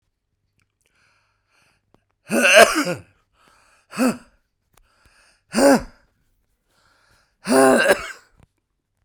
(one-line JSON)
{"exhalation_length": "9.0 s", "exhalation_amplitude": 32768, "exhalation_signal_mean_std_ratio": 0.32, "survey_phase": "beta (2021-08-13 to 2022-03-07)", "age": "65+", "gender": "Male", "wearing_mask": "No", "symptom_cough_any": true, "symptom_new_continuous_cough": true, "symptom_runny_or_blocked_nose": true, "symptom_headache": true, "symptom_onset": "6 days", "smoker_status": "Never smoked", "respiratory_condition_asthma": false, "respiratory_condition_other": false, "recruitment_source": "Test and Trace", "submission_delay": "1 day", "covid_test_result": "Positive", "covid_test_method": "RT-qPCR"}